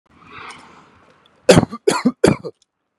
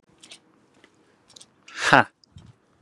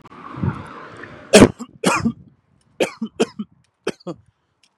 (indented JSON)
{
  "cough_length": "3.0 s",
  "cough_amplitude": 32768,
  "cough_signal_mean_std_ratio": 0.31,
  "exhalation_length": "2.8 s",
  "exhalation_amplitude": 32767,
  "exhalation_signal_mean_std_ratio": 0.2,
  "three_cough_length": "4.8 s",
  "three_cough_amplitude": 32768,
  "three_cough_signal_mean_std_ratio": 0.31,
  "survey_phase": "beta (2021-08-13 to 2022-03-07)",
  "age": "18-44",
  "gender": "Male",
  "wearing_mask": "Yes",
  "symptom_none": true,
  "symptom_onset": "8 days",
  "smoker_status": "Never smoked",
  "respiratory_condition_asthma": false,
  "respiratory_condition_other": false,
  "recruitment_source": "REACT",
  "submission_delay": "1 day",
  "covid_test_result": "Negative",
  "covid_test_method": "RT-qPCR",
  "influenza_a_test_result": "Negative",
  "influenza_b_test_result": "Negative"
}